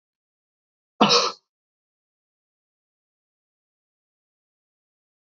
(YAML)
cough_length: 5.3 s
cough_amplitude: 32768
cough_signal_mean_std_ratio: 0.17
survey_phase: alpha (2021-03-01 to 2021-08-12)
age: 65+
gender: Male
wearing_mask: 'No'
symptom_none: true
smoker_status: Never smoked
respiratory_condition_asthma: false
respiratory_condition_other: false
recruitment_source: REACT
submission_delay: 1 day
covid_test_result: Negative
covid_test_method: RT-qPCR